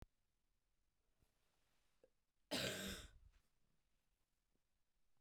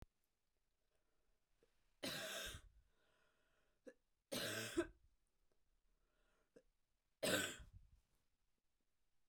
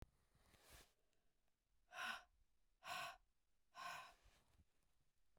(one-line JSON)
{"cough_length": "5.2 s", "cough_amplitude": 1185, "cough_signal_mean_std_ratio": 0.29, "three_cough_length": "9.3 s", "three_cough_amplitude": 1698, "three_cough_signal_mean_std_ratio": 0.32, "exhalation_length": "5.4 s", "exhalation_amplitude": 468, "exhalation_signal_mean_std_ratio": 0.41, "survey_phase": "beta (2021-08-13 to 2022-03-07)", "age": "18-44", "gender": "Female", "wearing_mask": "No", "symptom_runny_or_blocked_nose": true, "symptom_sore_throat": true, "symptom_fever_high_temperature": true, "symptom_headache": true, "symptom_change_to_sense_of_smell_or_taste": true, "symptom_loss_of_taste": true, "symptom_onset": "3 days", "smoker_status": "Never smoked", "respiratory_condition_asthma": false, "respiratory_condition_other": false, "recruitment_source": "Test and Trace", "submission_delay": "1 day", "covid_test_result": "Positive", "covid_test_method": "RT-qPCR", "covid_ct_value": 16.0, "covid_ct_gene": "ORF1ab gene"}